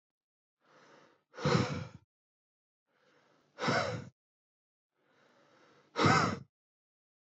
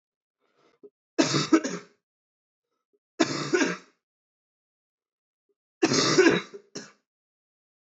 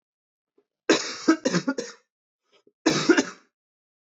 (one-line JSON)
{"exhalation_length": "7.3 s", "exhalation_amplitude": 8302, "exhalation_signal_mean_std_ratio": 0.32, "three_cough_length": "7.9 s", "three_cough_amplitude": 15644, "three_cough_signal_mean_std_ratio": 0.33, "cough_length": "4.2 s", "cough_amplitude": 18095, "cough_signal_mean_std_ratio": 0.35, "survey_phase": "beta (2021-08-13 to 2022-03-07)", "age": "18-44", "gender": "Male", "wearing_mask": "No", "symptom_cough_any": true, "symptom_runny_or_blocked_nose": true, "symptom_fatigue": true, "symptom_headache": true, "smoker_status": "Never smoked", "respiratory_condition_asthma": false, "respiratory_condition_other": false, "recruitment_source": "Test and Trace", "submission_delay": "2 days", "covid_test_result": "Positive", "covid_test_method": "RT-qPCR", "covid_ct_value": 27.3, "covid_ct_gene": "N gene"}